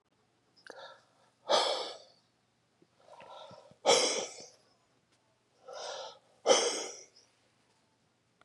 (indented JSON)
{
  "exhalation_length": "8.4 s",
  "exhalation_amplitude": 9883,
  "exhalation_signal_mean_std_ratio": 0.33,
  "survey_phase": "beta (2021-08-13 to 2022-03-07)",
  "age": "45-64",
  "gender": "Male",
  "wearing_mask": "No",
  "symptom_none": true,
  "smoker_status": "Never smoked",
  "respiratory_condition_asthma": false,
  "respiratory_condition_other": false,
  "recruitment_source": "REACT",
  "submission_delay": "2 days",
  "covid_test_result": "Negative",
  "covid_test_method": "RT-qPCR",
  "influenza_a_test_result": "Negative",
  "influenza_b_test_result": "Negative"
}